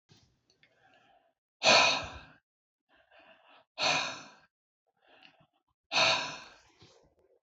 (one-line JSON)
{"exhalation_length": "7.4 s", "exhalation_amplitude": 10913, "exhalation_signal_mean_std_ratio": 0.31, "survey_phase": "beta (2021-08-13 to 2022-03-07)", "age": "65+", "gender": "Male", "wearing_mask": "No", "symptom_cough_any": true, "smoker_status": "Never smoked", "respiratory_condition_asthma": false, "respiratory_condition_other": true, "recruitment_source": "REACT", "submission_delay": "1 day", "covid_test_result": "Negative", "covid_test_method": "RT-qPCR"}